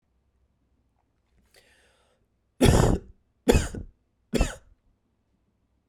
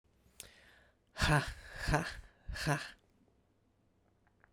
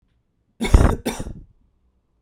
{"three_cough_length": "5.9 s", "three_cough_amplitude": 23763, "three_cough_signal_mean_std_ratio": 0.28, "exhalation_length": "4.5 s", "exhalation_amplitude": 5066, "exhalation_signal_mean_std_ratio": 0.38, "cough_length": "2.2 s", "cough_amplitude": 32767, "cough_signal_mean_std_ratio": 0.32, "survey_phase": "beta (2021-08-13 to 2022-03-07)", "age": "18-44", "gender": "Male", "wearing_mask": "No", "symptom_cough_any": true, "symptom_runny_or_blocked_nose": true, "symptom_fatigue": true, "symptom_headache": true, "symptom_change_to_sense_of_smell_or_taste": true, "symptom_loss_of_taste": true, "smoker_status": "Never smoked", "respiratory_condition_asthma": false, "respiratory_condition_other": false, "recruitment_source": "Test and Trace", "submission_delay": "2 days", "covid_test_result": "Positive", "covid_test_method": "LFT"}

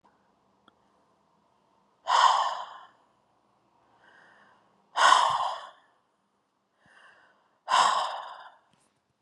{"exhalation_length": "9.2 s", "exhalation_amplitude": 19123, "exhalation_signal_mean_std_ratio": 0.33, "survey_phase": "beta (2021-08-13 to 2022-03-07)", "age": "45-64", "gender": "Female", "wearing_mask": "No", "symptom_none": true, "symptom_onset": "7 days", "smoker_status": "Ex-smoker", "respiratory_condition_asthma": true, "respiratory_condition_other": false, "recruitment_source": "REACT", "submission_delay": "1 day", "covid_test_result": "Negative", "covid_test_method": "RT-qPCR", "influenza_a_test_result": "Negative", "influenza_b_test_result": "Negative"}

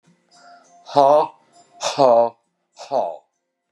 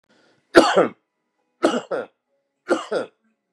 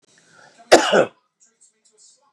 {"exhalation_length": "3.7 s", "exhalation_amplitude": 31579, "exhalation_signal_mean_std_ratio": 0.4, "three_cough_length": "3.5 s", "three_cough_amplitude": 32768, "three_cough_signal_mean_std_ratio": 0.34, "cough_length": "2.3 s", "cough_amplitude": 32768, "cough_signal_mean_std_ratio": 0.28, "survey_phase": "beta (2021-08-13 to 2022-03-07)", "age": "65+", "gender": "Male", "wearing_mask": "No", "symptom_cough_any": true, "smoker_status": "Ex-smoker", "respiratory_condition_asthma": false, "respiratory_condition_other": false, "recruitment_source": "REACT", "submission_delay": "5 days", "covid_test_result": "Negative", "covid_test_method": "RT-qPCR", "influenza_a_test_result": "Negative", "influenza_b_test_result": "Negative"}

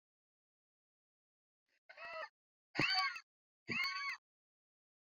{"exhalation_length": "5.0 s", "exhalation_amplitude": 3084, "exhalation_signal_mean_std_ratio": 0.36, "survey_phase": "beta (2021-08-13 to 2022-03-07)", "age": "45-64", "gender": "Female", "wearing_mask": "No", "symptom_cough_any": true, "symptom_fatigue": true, "symptom_headache": true, "symptom_change_to_sense_of_smell_or_taste": true, "symptom_loss_of_taste": true, "symptom_onset": "5 days", "smoker_status": "Never smoked", "respiratory_condition_asthma": false, "respiratory_condition_other": false, "recruitment_source": "Test and Trace", "submission_delay": "1 day", "covid_test_result": "Positive", "covid_test_method": "RT-qPCR", "covid_ct_value": 19.4, "covid_ct_gene": "ORF1ab gene"}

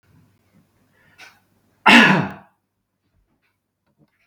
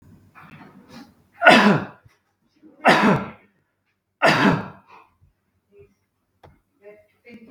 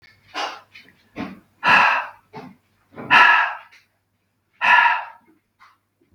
{"cough_length": "4.3 s", "cough_amplitude": 32768, "cough_signal_mean_std_ratio": 0.24, "three_cough_length": "7.5 s", "three_cough_amplitude": 32768, "three_cough_signal_mean_std_ratio": 0.33, "exhalation_length": "6.1 s", "exhalation_amplitude": 32768, "exhalation_signal_mean_std_ratio": 0.39, "survey_phase": "beta (2021-08-13 to 2022-03-07)", "age": "45-64", "gender": "Male", "wearing_mask": "No", "symptom_none": true, "smoker_status": "Ex-smoker", "respiratory_condition_asthma": false, "respiratory_condition_other": false, "recruitment_source": "REACT", "submission_delay": "2 days", "covid_test_result": "Negative", "covid_test_method": "RT-qPCR", "influenza_a_test_result": "Negative", "influenza_b_test_result": "Negative"}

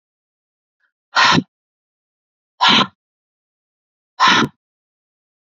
{"exhalation_length": "5.5 s", "exhalation_amplitude": 29341, "exhalation_signal_mean_std_ratio": 0.3, "survey_phase": "beta (2021-08-13 to 2022-03-07)", "age": "18-44", "gender": "Female", "wearing_mask": "No", "symptom_runny_or_blocked_nose": true, "symptom_sore_throat": true, "symptom_other": true, "smoker_status": "Ex-smoker", "respiratory_condition_asthma": false, "respiratory_condition_other": false, "recruitment_source": "Test and Trace", "submission_delay": "2 days", "covid_test_result": "Positive", "covid_test_method": "RT-qPCR", "covid_ct_value": 17.3, "covid_ct_gene": "N gene", "covid_ct_mean": 18.8, "covid_viral_load": "700000 copies/ml", "covid_viral_load_category": "Low viral load (10K-1M copies/ml)"}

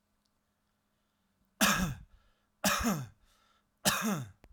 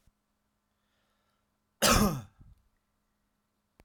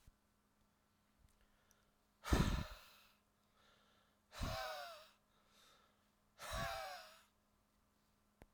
{"three_cough_length": "4.5 s", "three_cough_amplitude": 8098, "three_cough_signal_mean_std_ratio": 0.41, "cough_length": "3.8 s", "cough_amplitude": 11816, "cough_signal_mean_std_ratio": 0.25, "exhalation_length": "8.5 s", "exhalation_amplitude": 2856, "exhalation_signal_mean_std_ratio": 0.33, "survey_phase": "alpha (2021-03-01 to 2021-08-12)", "age": "18-44", "gender": "Male", "wearing_mask": "No", "symptom_none": true, "smoker_status": "Ex-smoker", "respiratory_condition_asthma": false, "respiratory_condition_other": false, "recruitment_source": "REACT", "submission_delay": "1 day", "covid_test_result": "Negative", "covid_test_method": "RT-qPCR"}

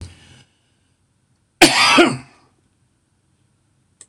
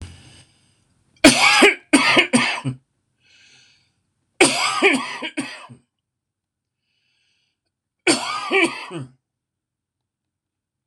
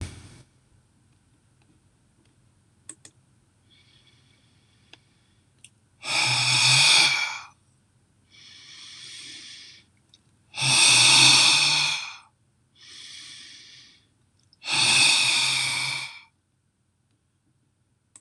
{"cough_length": "4.1 s", "cough_amplitude": 26028, "cough_signal_mean_std_ratio": 0.29, "three_cough_length": "10.9 s", "three_cough_amplitude": 26028, "three_cough_signal_mean_std_ratio": 0.37, "exhalation_length": "18.2 s", "exhalation_amplitude": 23731, "exhalation_signal_mean_std_ratio": 0.4, "survey_phase": "beta (2021-08-13 to 2022-03-07)", "age": "45-64", "gender": "Male", "wearing_mask": "No", "symptom_none": true, "smoker_status": "Ex-smoker", "respiratory_condition_asthma": false, "respiratory_condition_other": false, "recruitment_source": "REACT", "submission_delay": "1 day", "covid_test_result": "Negative", "covid_test_method": "RT-qPCR", "influenza_a_test_result": "Negative", "influenza_b_test_result": "Negative"}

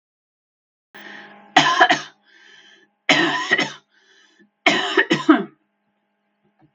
{"three_cough_length": "6.7 s", "three_cough_amplitude": 32767, "three_cough_signal_mean_std_ratio": 0.37, "survey_phase": "beta (2021-08-13 to 2022-03-07)", "age": "45-64", "gender": "Female", "wearing_mask": "No", "symptom_cough_any": true, "symptom_runny_or_blocked_nose": true, "symptom_fatigue": true, "symptom_fever_high_temperature": true, "symptom_change_to_sense_of_smell_or_taste": true, "symptom_onset": "3 days", "smoker_status": "Never smoked", "respiratory_condition_asthma": false, "respiratory_condition_other": false, "recruitment_source": "Test and Trace", "submission_delay": "2 days", "covid_test_result": "Positive", "covid_test_method": "RT-qPCR", "covid_ct_value": 14.8, "covid_ct_gene": "ORF1ab gene", "covid_ct_mean": 15.9, "covid_viral_load": "6000000 copies/ml", "covid_viral_load_category": "High viral load (>1M copies/ml)"}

